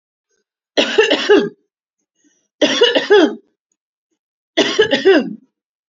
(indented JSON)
{
  "three_cough_length": "5.9 s",
  "three_cough_amplitude": 31679,
  "three_cough_signal_mean_std_ratio": 0.46,
  "survey_phase": "beta (2021-08-13 to 2022-03-07)",
  "age": "45-64",
  "gender": "Female",
  "wearing_mask": "No",
  "symptom_abdominal_pain": true,
  "symptom_fatigue": true,
  "symptom_onset": "6 days",
  "smoker_status": "Ex-smoker",
  "respiratory_condition_asthma": false,
  "respiratory_condition_other": false,
  "recruitment_source": "REACT",
  "submission_delay": "2 days",
  "covid_test_result": "Negative",
  "covid_test_method": "RT-qPCR",
  "influenza_a_test_result": "Unknown/Void",
  "influenza_b_test_result": "Unknown/Void"
}